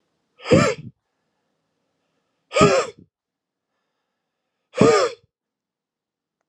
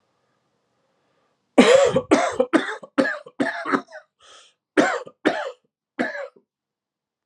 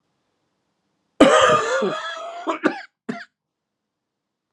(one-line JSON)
{"exhalation_length": "6.5 s", "exhalation_amplitude": 32127, "exhalation_signal_mean_std_ratio": 0.3, "three_cough_length": "7.3 s", "three_cough_amplitude": 32748, "three_cough_signal_mean_std_ratio": 0.39, "cough_length": "4.5 s", "cough_amplitude": 32767, "cough_signal_mean_std_ratio": 0.38, "survey_phase": "beta (2021-08-13 to 2022-03-07)", "age": "45-64", "gender": "Male", "wearing_mask": "No", "symptom_cough_any": true, "symptom_new_continuous_cough": true, "symptom_runny_or_blocked_nose": true, "symptom_sore_throat": true, "symptom_change_to_sense_of_smell_or_taste": true, "symptom_loss_of_taste": true, "smoker_status": "Never smoked", "respiratory_condition_asthma": false, "respiratory_condition_other": false, "recruitment_source": "Test and Trace", "submission_delay": "2 days", "covid_test_result": "Positive", "covid_test_method": "LAMP"}